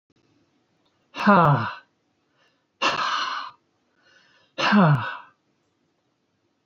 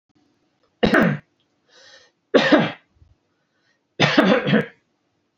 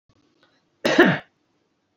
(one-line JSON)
{"exhalation_length": "6.7 s", "exhalation_amplitude": 21183, "exhalation_signal_mean_std_ratio": 0.38, "three_cough_length": "5.4 s", "three_cough_amplitude": 27703, "three_cough_signal_mean_std_ratio": 0.39, "cough_length": "2.0 s", "cough_amplitude": 27412, "cough_signal_mean_std_ratio": 0.31, "survey_phase": "alpha (2021-03-01 to 2021-08-12)", "age": "65+", "gender": "Male", "wearing_mask": "No", "symptom_none": true, "smoker_status": "Ex-smoker", "respiratory_condition_asthma": false, "respiratory_condition_other": false, "recruitment_source": "REACT", "submission_delay": "2 days", "covid_test_result": "Negative", "covid_test_method": "RT-qPCR"}